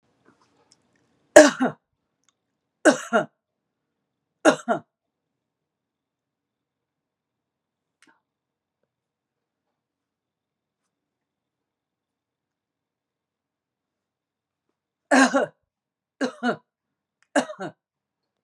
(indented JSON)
{
  "three_cough_length": "18.4 s",
  "three_cough_amplitude": 32768,
  "three_cough_signal_mean_std_ratio": 0.18,
  "survey_phase": "beta (2021-08-13 to 2022-03-07)",
  "age": "65+",
  "gender": "Female",
  "wearing_mask": "No",
  "symptom_none": true,
  "smoker_status": "Never smoked",
  "respiratory_condition_asthma": false,
  "respiratory_condition_other": false,
  "recruitment_source": "REACT",
  "submission_delay": "1 day",
  "covid_test_result": "Negative",
  "covid_test_method": "RT-qPCR",
  "influenza_a_test_result": "Negative",
  "influenza_b_test_result": "Negative"
}